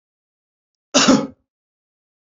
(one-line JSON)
{"cough_length": "2.2 s", "cough_amplitude": 28795, "cough_signal_mean_std_ratio": 0.29, "survey_phase": "beta (2021-08-13 to 2022-03-07)", "age": "18-44", "gender": "Male", "wearing_mask": "No", "symptom_none": true, "smoker_status": "Never smoked", "respiratory_condition_asthma": false, "respiratory_condition_other": false, "recruitment_source": "REACT", "submission_delay": "2 days", "covid_test_result": "Negative", "covid_test_method": "RT-qPCR", "influenza_a_test_result": "Negative", "influenza_b_test_result": "Negative"}